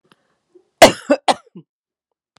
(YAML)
cough_length: 2.4 s
cough_amplitude: 32768
cough_signal_mean_std_ratio: 0.23
survey_phase: alpha (2021-03-01 to 2021-08-12)
age: 65+
gender: Female
wearing_mask: 'No'
symptom_none: true
smoker_status: Ex-smoker
respiratory_condition_asthma: false
respiratory_condition_other: false
recruitment_source: REACT
submission_delay: 3 days
covid_test_result: Negative
covid_test_method: RT-qPCR